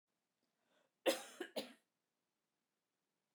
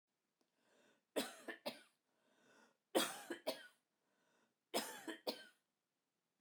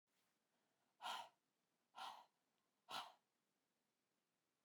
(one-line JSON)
{"cough_length": "3.3 s", "cough_amplitude": 2914, "cough_signal_mean_std_ratio": 0.22, "three_cough_length": "6.4 s", "three_cough_amplitude": 3085, "three_cough_signal_mean_std_ratio": 0.31, "exhalation_length": "4.6 s", "exhalation_amplitude": 442, "exhalation_signal_mean_std_ratio": 0.32, "survey_phase": "beta (2021-08-13 to 2022-03-07)", "age": "45-64", "gender": "Female", "wearing_mask": "No", "symptom_none": true, "smoker_status": "Never smoked", "respiratory_condition_asthma": false, "respiratory_condition_other": false, "recruitment_source": "REACT", "submission_delay": "1 day", "covid_test_method": "RT-qPCR"}